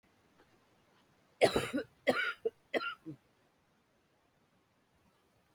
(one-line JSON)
{"cough_length": "5.5 s", "cough_amplitude": 7958, "cough_signal_mean_std_ratio": 0.29, "survey_phase": "beta (2021-08-13 to 2022-03-07)", "age": "45-64", "gender": "Female", "wearing_mask": "No", "symptom_cough_any": true, "symptom_runny_or_blocked_nose": true, "symptom_shortness_of_breath": true, "symptom_sore_throat": true, "symptom_abdominal_pain": true, "symptom_fatigue": true, "symptom_fever_high_temperature": true, "symptom_headache": true, "symptom_other": true, "symptom_onset": "4 days", "smoker_status": "Never smoked", "respiratory_condition_asthma": false, "respiratory_condition_other": false, "recruitment_source": "Test and Trace", "submission_delay": "2 days", "covid_test_result": "Positive", "covid_test_method": "RT-qPCR", "covid_ct_value": 17.0, "covid_ct_gene": "ORF1ab gene"}